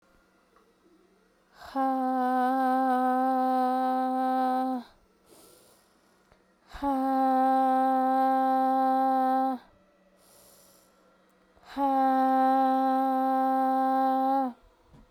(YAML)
exhalation_length: 15.1 s
exhalation_amplitude: 5640
exhalation_signal_mean_std_ratio: 0.77
survey_phase: beta (2021-08-13 to 2022-03-07)
age: 18-44
gender: Female
wearing_mask: 'No'
symptom_cough_any: true
symptom_new_continuous_cough: true
symptom_fatigue: true
symptom_headache: true
symptom_onset: 4 days
smoker_status: Never smoked
respiratory_condition_asthma: false
respiratory_condition_other: false
recruitment_source: Test and Trace
submission_delay: 2 days
covid_test_result: Positive
covid_test_method: RT-qPCR